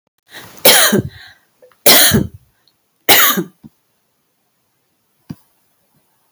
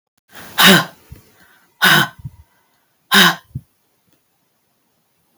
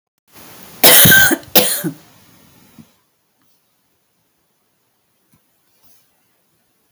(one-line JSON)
{"three_cough_length": "6.3 s", "three_cough_amplitude": 32768, "three_cough_signal_mean_std_ratio": 0.35, "exhalation_length": "5.4 s", "exhalation_amplitude": 32768, "exhalation_signal_mean_std_ratio": 0.31, "cough_length": "6.9 s", "cough_amplitude": 32768, "cough_signal_mean_std_ratio": 0.28, "survey_phase": "beta (2021-08-13 to 2022-03-07)", "age": "65+", "gender": "Female", "wearing_mask": "No", "symptom_runny_or_blocked_nose": true, "symptom_shortness_of_breath": true, "symptom_fatigue": true, "symptom_other": true, "symptom_onset": "5 days", "smoker_status": "Never smoked", "respiratory_condition_asthma": false, "respiratory_condition_other": true, "recruitment_source": "REACT", "submission_delay": "2 days", "covid_test_result": "Negative", "covid_test_method": "RT-qPCR", "influenza_a_test_result": "Negative", "influenza_b_test_result": "Negative"}